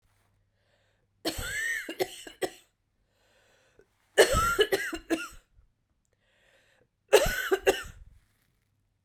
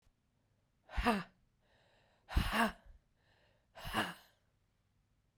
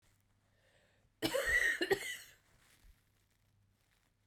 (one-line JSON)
{"three_cough_length": "9.0 s", "three_cough_amplitude": 16650, "three_cough_signal_mean_std_ratio": 0.34, "exhalation_length": "5.4 s", "exhalation_amplitude": 4291, "exhalation_signal_mean_std_ratio": 0.33, "cough_length": "4.3 s", "cough_amplitude": 3891, "cough_signal_mean_std_ratio": 0.37, "survey_phase": "beta (2021-08-13 to 2022-03-07)", "age": "45-64", "gender": "Female", "wearing_mask": "No", "symptom_cough_any": true, "symptom_runny_or_blocked_nose": true, "symptom_diarrhoea": true, "symptom_fatigue": true, "symptom_fever_high_temperature": true, "symptom_headache": true, "symptom_onset": "2 days", "smoker_status": "Ex-smoker", "respiratory_condition_asthma": false, "respiratory_condition_other": false, "recruitment_source": "Test and Trace", "submission_delay": "2 days", "covid_test_result": "Positive", "covid_test_method": "RT-qPCR"}